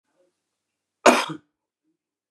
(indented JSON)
{
  "cough_length": "2.3 s",
  "cough_amplitude": 32767,
  "cough_signal_mean_std_ratio": 0.21,
  "survey_phase": "beta (2021-08-13 to 2022-03-07)",
  "age": "45-64",
  "gender": "Male",
  "wearing_mask": "No",
  "symptom_cough_any": true,
  "symptom_shortness_of_breath": true,
  "symptom_abdominal_pain": true,
  "symptom_fatigue": true,
  "smoker_status": "Ex-smoker",
  "respiratory_condition_asthma": false,
  "respiratory_condition_other": false,
  "recruitment_source": "REACT",
  "submission_delay": "1 day",
  "covid_test_result": "Negative",
  "covid_test_method": "RT-qPCR",
  "influenza_a_test_result": "Negative",
  "influenza_b_test_result": "Negative"
}